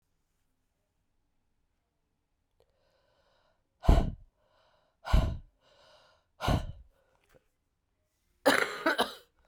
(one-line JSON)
{"exhalation_length": "9.5 s", "exhalation_amplitude": 11143, "exhalation_signal_mean_std_ratio": 0.27, "survey_phase": "alpha (2021-03-01 to 2021-08-12)", "age": "45-64", "gender": "Female", "wearing_mask": "No", "symptom_cough_any": true, "symptom_new_continuous_cough": true, "symptom_abdominal_pain": true, "symptom_diarrhoea": true, "symptom_fatigue": true, "symptom_fever_high_temperature": true, "symptom_headache": true, "symptom_onset": "2 days", "smoker_status": "Ex-smoker", "respiratory_condition_asthma": false, "respiratory_condition_other": false, "recruitment_source": "Test and Trace", "submission_delay": "1 day", "covid_test_result": "Positive", "covid_test_method": "RT-qPCR"}